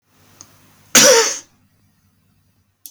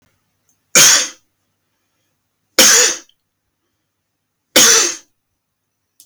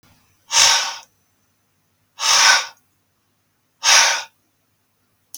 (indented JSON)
{
  "cough_length": "2.9 s",
  "cough_amplitude": 32768,
  "cough_signal_mean_std_ratio": 0.31,
  "three_cough_length": "6.1 s",
  "three_cough_amplitude": 32768,
  "three_cough_signal_mean_std_ratio": 0.35,
  "exhalation_length": "5.4 s",
  "exhalation_amplitude": 32768,
  "exhalation_signal_mean_std_ratio": 0.38,
  "survey_phase": "beta (2021-08-13 to 2022-03-07)",
  "age": "45-64",
  "gender": "Male",
  "wearing_mask": "No",
  "symptom_cough_any": true,
  "smoker_status": "Ex-smoker",
  "respiratory_condition_asthma": false,
  "respiratory_condition_other": false,
  "recruitment_source": "REACT",
  "submission_delay": "1 day",
  "covid_test_result": "Negative",
  "covid_test_method": "RT-qPCR",
  "influenza_a_test_result": "Negative",
  "influenza_b_test_result": "Negative"
}